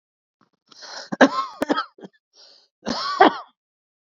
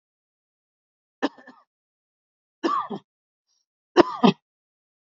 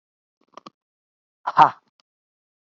{"cough_length": "4.2 s", "cough_amplitude": 29245, "cough_signal_mean_std_ratio": 0.3, "three_cough_length": "5.1 s", "three_cough_amplitude": 27021, "three_cough_signal_mean_std_ratio": 0.21, "exhalation_length": "2.7 s", "exhalation_amplitude": 27054, "exhalation_signal_mean_std_ratio": 0.17, "survey_phase": "beta (2021-08-13 to 2022-03-07)", "age": "45-64", "gender": "Male", "wearing_mask": "No", "symptom_cough_any": true, "smoker_status": "Ex-smoker", "respiratory_condition_asthma": false, "respiratory_condition_other": false, "recruitment_source": "REACT", "submission_delay": "1 day", "covid_test_result": "Negative", "covid_test_method": "RT-qPCR", "influenza_a_test_result": "Negative", "influenza_b_test_result": "Negative"}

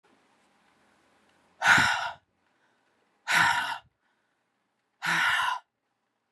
{"exhalation_length": "6.3 s", "exhalation_amplitude": 15360, "exhalation_signal_mean_std_ratio": 0.38, "survey_phase": "beta (2021-08-13 to 2022-03-07)", "age": "45-64", "gender": "Female", "wearing_mask": "No", "symptom_new_continuous_cough": true, "symptom_runny_or_blocked_nose": true, "symptom_shortness_of_breath": true, "symptom_fatigue": true, "symptom_headache": true, "symptom_change_to_sense_of_smell_or_taste": true, "symptom_onset": "3 days", "smoker_status": "Never smoked", "respiratory_condition_asthma": false, "respiratory_condition_other": false, "recruitment_source": "Test and Trace", "submission_delay": "1 day", "covid_test_result": "Positive", "covid_test_method": "RT-qPCR", "covid_ct_value": 21.1, "covid_ct_gene": "ORF1ab gene", "covid_ct_mean": 22.0, "covid_viral_load": "63000 copies/ml", "covid_viral_load_category": "Low viral load (10K-1M copies/ml)"}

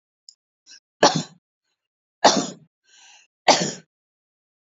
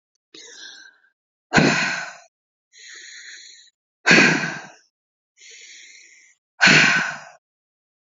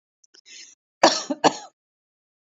{"three_cough_length": "4.6 s", "three_cough_amplitude": 30098, "three_cough_signal_mean_std_ratio": 0.26, "exhalation_length": "8.2 s", "exhalation_amplitude": 28079, "exhalation_signal_mean_std_ratio": 0.35, "cough_length": "2.5 s", "cough_amplitude": 29423, "cough_signal_mean_std_ratio": 0.25, "survey_phase": "beta (2021-08-13 to 2022-03-07)", "age": "18-44", "gender": "Female", "wearing_mask": "No", "symptom_cough_any": true, "symptom_runny_or_blocked_nose": true, "symptom_sore_throat": true, "symptom_onset": "12 days", "smoker_status": "Current smoker (1 to 10 cigarettes per day)", "respiratory_condition_asthma": false, "respiratory_condition_other": false, "recruitment_source": "REACT", "submission_delay": "1 day", "covid_test_result": "Negative", "covid_test_method": "RT-qPCR", "influenza_a_test_result": "Unknown/Void", "influenza_b_test_result": "Unknown/Void"}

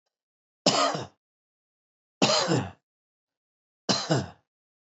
{"three_cough_length": "4.9 s", "three_cough_amplitude": 15393, "three_cough_signal_mean_std_ratio": 0.38, "survey_phase": "beta (2021-08-13 to 2022-03-07)", "age": "65+", "gender": "Male", "wearing_mask": "Yes", "symptom_runny_or_blocked_nose": true, "symptom_shortness_of_breath": true, "symptom_fatigue": true, "symptom_headache": true, "symptom_onset": "12 days", "smoker_status": "Ex-smoker", "respiratory_condition_asthma": true, "respiratory_condition_other": false, "recruitment_source": "REACT", "submission_delay": "1 day", "covid_test_result": "Negative", "covid_test_method": "RT-qPCR", "influenza_a_test_result": "Negative", "influenza_b_test_result": "Negative"}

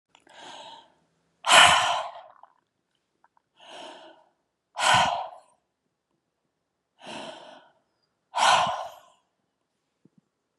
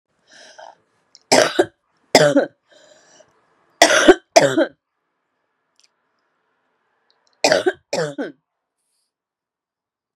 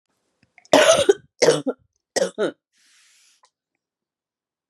{"exhalation_length": "10.6 s", "exhalation_amplitude": 29430, "exhalation_signal_mean_std_ratio": 0.3, "three_cough_length": "10.2 s", "three_cough_amplitude": 32768, "three_cough_signal_mean_std_ratio": 0.29, "cough_length": "4.7 s", "cough_amplitude": 32497, "cough_signal_mean_std_ratio": 0.32, "survey_phase": "beta (2021-08-13 to 2022-03-07)", "age": "45-64", "gender": "Female", "wearing_mask": "No", "symptom_cough_any": true, "symptom_shortness_of_breath": true, "symptom_sore_throat": true, "symptom_fatigue": true, "smoker_status": "Ex-smoker", "respiratory_condition_asthma": false, "respiratory_condition_other": false, "recruitment_source": "Test and Trace", "submission_delay": "1 day", "covid_test_result": "Positive", "covid_test_method": "LFT"}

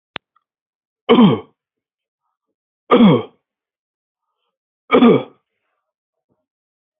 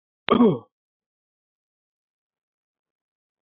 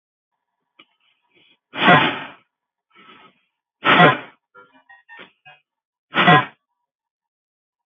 {"three_cough_length": "7.0 s", "three_cough_amplitude": 31777, "three_cough_signal_mean_std_ratio": 0.29, "cough_length": "3.4 s", "cough_amplitude": 25761, "cough_signal_mean_std_ratio": 0.22, "exhalation_length": "7.9 s", "exhalation_amplitude": 29878, "exhalation_signal_mean_std_ratio": 0.28, "survey_phase": "beta (2021-08-13 to 2022-03-07)", "age": "18-44", "gender": "Male", "wearing_mask": "No", "symptom_none": true, "smoker_status": "Never smoked", "respiratory_condition_asthma": false, "respiratory_condition_other": false, "recruitment_source": "REACT", "submission_delay": "1 day", "covid_test_result": "Negative", "covid_test_method": "RT-qPCR", "influenza_a_test_result": "Negative", "influenza_b_test_result": "Negative"}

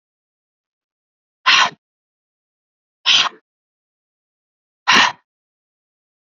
{"exhalation_length": "6.2 s", "exhalation_amplitude": 31041, "exhalation_signal_mean_std_ratio": 0.26, "survey_phase": "beta (2021-08-13 to 2022-03-07)", "age": "18-44", "gender": "Male", "wearing_mask": "No", "symptom_sore_throat": true, "symptom_diarrhoea": true, "smoker_status": "Never smoked", "respiratory_condition_asthma": false, "respiratory_condition_other": false, "recruitment_source": "REACT", "submission_delay": "0 days", "covid_test_result": "Negative", "covid_test_method": "RT-qPCR", "influenza_a_test_result": "Negative", "influenza_b_test_result": "Negative"}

